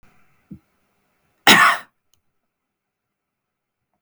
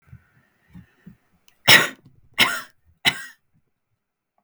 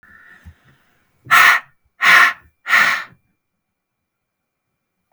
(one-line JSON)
{"cough_length": "4.0 s", "cough_amplitude": 32768, "cough_signal_mean_std_ratio": 0.22, "three_cough_length": "4.4 s", "three_cough_amplitude": 32768, "three_cough_signal_mean_std_ratio": 0.24, "exhalation_length": "5.1 s", "exhalation_amplitude": 32768, "exhalation_signal_mean_std_ratio": 0.34, "survey_phase": "beta (2021-08-13 to 2022-03-07)", "age": "45-64", "gender": "Male", "wearing_mask": "No", "symptom_none": true, "smoker_status": "Never smoked", "respiratory_condition_asthma": true, "respiratory_condition_other": false, "recruitment_source": "REACT", "submission_delay": "1 day", "covid_test_result": "Negative", "covid_test_method": "RT-qPCR", "influenza_a_test_result": "Negative", "influenza_b_test_result": "Negative"}